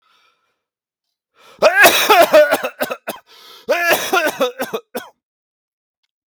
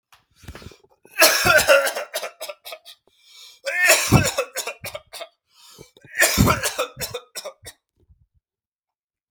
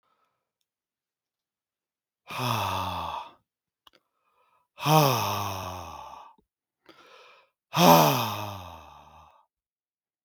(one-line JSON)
{"cough_length": "6.3 s", "cough_amplitude": 32768, "cough_signal_mean_std_ratio": 0.44, "three_cough_length": "9.3 s", "three_cough_amplitude": 32229, "three_cough_signal_mean_std_ratio": 0.41, "exhalation_length": "10.2 s", "exhalation_amplitude": 25529, "exhalation_signal_mean_std_ratio": 0.34, "survey_phase": "beta (2021-08-13 to 2022-03-07)", "age": "18-44", "gender": "Male", "wearing_mask": "No", "symptom_none": true, "smoker_status": "Never smoked", "respiratory_condition_asthma": false, "respiratory_condition_other": false, "recruitment_source": "REACT", "submission_delay": "1 day", "covid_test_result": "Negative", "covid_test_method": "RT-qPCR", "influenza_a_test_result": "Negative", "influenza_b_test_result": "Negative"}